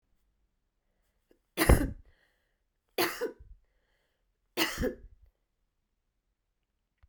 {
  "three_cough_length": "7.1 s",
  "three_cough_amplitude": 22756,
  "three_cough_signal_mean_std_ratio": 0.25,
  "survey_phase": "beta (2021-08-13 to 2022-03-07)",
  "age": "65+",
  "gender": "Female",
  "wearing_mask": "No",
  "symptom_none": true,
  "smoker_status": "Never smoked",
  "respiratory_condition_asthma": false,
  "respiratory_condition_other": false,
  "recruitment_source": "REACT",
  "submission_delay": "1 day",
  "covid_test_result": "Negative",
  "covid_test_method": "RT-qPCR"
}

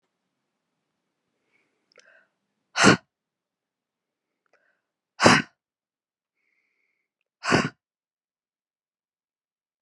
{
  "exhalation_length": "9.8 s",
  "exhalation_amplitude": 29478,
  "exhalation_signal_mean_std_ratio": 0.18,
  "survey_phase": "beta (2021-08-13 to 2022-03-07)",
  "age": "18-44",
  "gender": "Female",
  "wearing_mask": "No",
  "symptom_cough_any": true,
  "symptom_runny_or_blocked_nose": true,
  "symptom_sore_throat": true,
  "symptom_fatigue": true,
  "symptom_fever_high_temperature": true,
  "symptom_change_to_sense_of_smell_or_taste": true,
  "symptom_onset": "3 days",
  "smoker_status": "Never smoked",
  "respiratory_condition_asthma": false,
  "respiratory_condition_other": false,
  "recruitment_source": "Test and Trace",
  "submission_delay": "2 days",
  "covid_test_result": "Positive",
  "covid_test_method": "RT-qPCR",
  "covid_ct_value": 30.0,
  "covid_ct_gene": "ORF1ab gene",
  "covid_ct_mean": 31.1,
  "covid_viral_load": "61 copies/ml",
  "covid_viral_load_category": "Minimal viral load (< 10K copies/ml)"
}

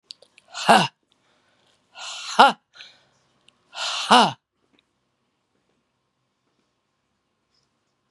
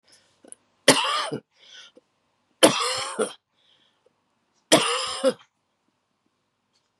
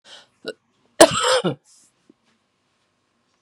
{
  "exhalation_length": "8.1 s",
  "exhalation_amplitude": 32767,
  "exhalation_signal_mean_std_ratio": 0.23,
  "three_cough_length": "7.0 s",
  "three_cough_amplitude": 30633,
  "three_cough_signal_mean_std_ratio": 0.32,
  "cough_length": "3.4 s",
  "cough_amplitude": 32768,
  "cough_signal_mean_std_ratio": 0.25,
  "survey_phase": "beta (2021-08-13 to 2022-03-07)",
  "age": "65+",
  "gender": "Female",
  "wearing_mask": "No",
  "symptom_cough_any": true,
  "symptom_runny_or_blocked_nose": true,
  "smoker_status": "Never smoked",
  "respiratory_condition_asthma": false,
  "respiratory_condition_other": false,
  "recruitment_source": "Test and Trace",
  "submission_delay": "1 day",
  "covid_test_result": "Positive",
  "covid_test_method": "RT-qPCR"
}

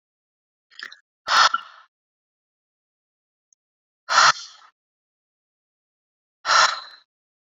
{
  "exhalation_length": "7.6 s",
  "exhalation_amplitude": 23713,
  "exhalation_signal_mean_std_ratio": 0.26,
  "survey_phase": "beta (2021-08-13 to 2022-03-07)",
  "age": "45-64",
  "gender": "Female",
  "wearing_mask": "No",
  "symptom_none": true,
  "smoker_status": "Current smoker (1 to 10 cigarettes per day)",
  "respiratory_condition_asthma": false,
  "respiratory_condition_other": false,
  "recruitment_source": "REACT",
  "submission_delay": "4 days",
  "covid_test_result": "Negative",
  "covid_test_method": "RT-qPCR"
}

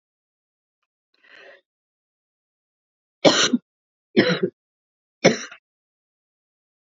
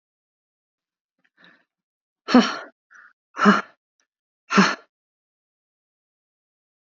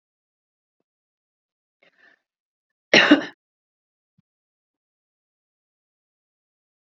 {
  "three_cough_length": "6.9 s",
  "three_cough_amplitude": 32768,
  "three_cough_signal_mean_std_ratio": 0.24,
  "exhalation_length": "6.9 s",
  "exhalation_amplitude": 27708,
  "exhalation_signal_mean_std_ratio": 0.23,
  "cough_length": "7.0 s",
  "cough_amplitude": 29624,
  "cough_signal_mean_std_ratio": 0.15,
  "survey_phase": "beta (2021-08-13 to 2022-03-07)",
  "age": "45-64",
  "gender": "Female",
  "wearing_mask": "No",
  "symptom_none": true,
  "smoker_status": "Never smoked",
  "respiratory_condition_asthma": true,
  "respiratory_condition_other": false,
  "recruitment_source": "REACT",
  "submission_delay": "2 days",
  "covid_test_result": "Negative",
  "covid_test_method": "RT-qPCR",
  "influenza_a_test_result": "Negative",
  "influenza_b_test_result": "Negative"
}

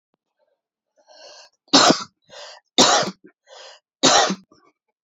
{
  "three_cough_length": "5.0 s",
  "three_cough_amplitude": 30406,
  "three_cough_signal_mean_std_ratio": 0.34,
  "survey_phase": "alpha (2021-03-01 to 2021-08-12)",
  "age": "18-44",
  "gender": "Male",
  "wearing_mask": "No",
  "symptom_cough_any": true,
  "symptom_new_continuous_cough": true,
  "symptom_diarrhoea": true,
  "symptom_fatigue": true,
  "symptom_onset": "3 days",
  "smoker_status": "Current smoker (e-cigarettes or vapes only)",
  "respiratory_condition_asthma": false,
  "respiratory_condition_other": false,
  "recruitment_source": "Test and Trace",
  "submission_delay": "2 days",
  "covid_test_result": "Positive",
  "covid_test_method": "ePCR"
}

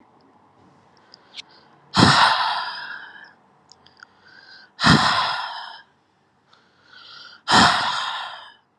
{
  "exhalation_length": "8.8 s",
  "exhalation_amplitude": 31170,
  "exhalation_signal_mean_std_ratio": 0.41,
  "survey_phase": "alpha (2021-03-01 to 2021-08-12)",
  "age": "18-44",
  "gender": "Female",
  "wearing_mask": "No",
  "symptom_cough_any": true,
  "symptom_new_continuous_cough": true,
  "symptom_abdominal_pain": true,
  "symptom_fatigue": true,
  "symptom_fever_high_temperature": true,
  "symptom_headache": true,
  "symptom_change_to_sense_of_smell_or_taste": true,
  "symptom_onset": "3 days",
  "smoker_status": "Ex-smoker",
  "respiratory_condition_asthma": true,
  "respiratory_condition_other": false,
  "recruitment_source": "Test and Trace",
  "submission_delay": "1 day",
  "covid_test_result": "Positive",
  "covid_test_method": "RT-qPCR",
  "covid_ct_value": 12.6,
  "covid_ct_gene": "ORF1ab gene",
  "covid_ct_mean": 13.2,
  "covid_viral_load": "48000000 copies/ml",
  "covid_viral_load_category": "High viral load (>1M copies/ml)"
}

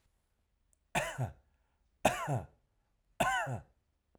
{
  "three_cough_length": "4.2 s",
  "three_cough_amplitude": 7981,
  "three_cough_signal_mean_std_ratio": 0.39,
  "survey_phase": "beta (2021-08-13 to 2022-03-07)",
  "age": "45-64",
  "gender": "Male",
  "wearing_mask": "No",
  "symptom_none": true,
  "smoker_status": "Ex-smoker",
  "respiratory_condition_asthma": false,
  "respiratory_condition_other": false,
  "recruitment_source": "REACT",
  "submission_delay": "2 days",
  "covid_test_result": "Negative",
  "covid_test_method": "RT-qPCR",
  "influenza_a_test_result": "Negative",
  "influenza_b_test_result": "Negative"
}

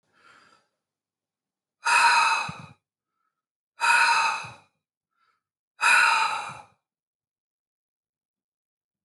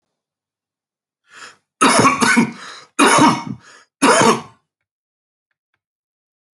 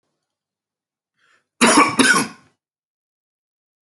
{
  "exhalation_length": "9.0 s",
  "exhalation_amplitude": 13474,
  "exhalation_signal_mean_std_ratio": 0.38,
  "three_cough_length": "6.6 s",
  "three_cough_amplitude": 30880,
  "three_cough_signal_mean_std_ratio": 0.4,
  "cough_length": "3.9 s",
  "cough_amplitude": 29687,
  "cough_signal_mean_std_ratio": 0.31,
  "survey_phase": "alpha (2021-03-01 to 2021-08-12)",
  "age": "45-64",
  "gender": "Male",
  "wearing_mask": "No",
  "symptom_none": true,
  "smoker_status": "Ex-smoker",
  "respiratory_condition_asthma": false,
  "respiratory_condition_other": false,
  "recruitment_source": "REACT",
  "submission_delay": "1 day",
  "covid_test_result": "Negative",
  "covid_test_method": "RT-qPCR"
}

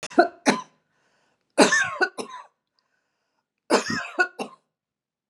{
  "three_cough_length": "5.3 s",
  "three_cough_amplitude": 27536,
  "three_cough_signal_mean_std_ratio": 0.35,
  "survey_phase": "beta (2021-08-13 to 2022-03-07)",
  "age": "45-64",
  "gender": "Female",
  "wearing_mask": "No",
  "symptom_none": true,
  "symptom_onset": "12 days",
  "smoker_status": "Never smoked",
  "respiratory_condition_asthma": false,
  "respiratory_condition_other": false,
  "recruitment_source": "REACT",
  "submission_delay": "1 day",
  "covid_test_result": "Negative",
  "covid_test_method": "RT-qPCR",
  "influenza_a_test_result": "Unknown/Void",
  "influenza_b_test_result": "Unknown/Void"
}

